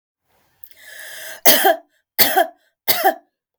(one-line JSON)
{"three_cough_length": "3.6 s", "three_cough_amplitude": 32768, "three_cough_signal_mean_std_ratio": 0.39, "survey_phase": "beta (2021-08-13 to 2022-03-07)", "age": "65+", "gender": "Female", "wearing_mask": "No", "symptom_none": true, "smoker_status": "Ex-smoker", "respiratory_condition_asthma": false, "respiratory_condition_other": false, "recruitment_source": "REACT", "submission_delay": "2 days", "covid_test_result": "Negative", "covid_test_method": "RT-qPCR", "influenza_a_test_result": "Negative", "influenza_b_test_result": "Negative"}